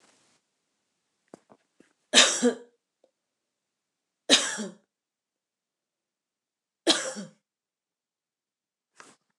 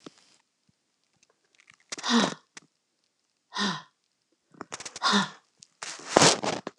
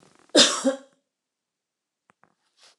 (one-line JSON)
{"three_cough_length": "9.4 s", "three_cough_amplitude": 26766, "three_cough_signal_mean_std_ratio": 0.22, "exhalation_length": "6.8 s", "exhalation_amplitude": 29204, "exhalation_signal_mean_std_ratio": 0.32, "cough_length": "2.8 s", "cough_amplitude": 23872, "cough_signal_mean_std_ratio": 0.26, "survey_phase": "beta (2021-08-13 to 2022-03-07)", "age": "45-64", "gender": "Female", "wearing_mask": "No", "symptom_change_to_sense_of_smell_or_taste": true, "symptom_loss_of_taste": true, "smoker_status": "Never smoked", "respiratory_condition_asthma": false, "respiratory_condition_other": false, "recruitment_source": "REACT", "submission_delay": "1 day", "covid_test_result": "Negative", "covid_test_method": "RT-qPCR"}